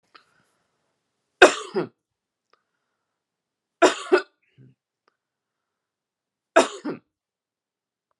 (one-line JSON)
{"three_cough_length": "8.2 s", "three_cough_amplitude": 32768, "three_cough_signal_mean_std_ratio": 0.19, "survey_phase": "alpha (2021-03-01 to 2021-08-12)", "age": "45-64", "gender": "Female", "wearing_mask": "No", "symptom_shortness_of_breath": true, "smoker_status": "Current smoker (1 to 10 cigarettes per day)", "respiratory_condition_asthma": false, "respiratory_condition_other": false, "recruitment_source": "REACT", "submission_delay": "3 days", "covid_test_result": "Negative", "covid_test_method": "RT-qPCR"}